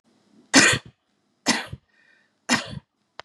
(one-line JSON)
{"three_cough_length": "3.2 s", "three_cough_amplitude": 30688, "three_cough_signal_mean_std_ratio": 0.31, "survey_phase": "beta (2021-08-13 to 2022-03-07)", "age": "18-44", "gender": "Female", "wearing_mask": "No", "symptom_runny_or_blocked_nose": true, "symptom_fatigue": true, "symptom_headache": true, "symptom_change_to_sense_of_smell_or_taste": true, "symptom_onset": "3 days", "smoker_status": "Never smoked", "respiratory_condition_asthma": false, "respiratory_condition_other": false, "recruitment_source": "Test and Trace", "submission_delay": "2 days", "covid_test_result": "Positive", "covid_test_method": "RT-qPCR", "covid_ct_value": 21.7, "covid_ct_gene": "N gene"}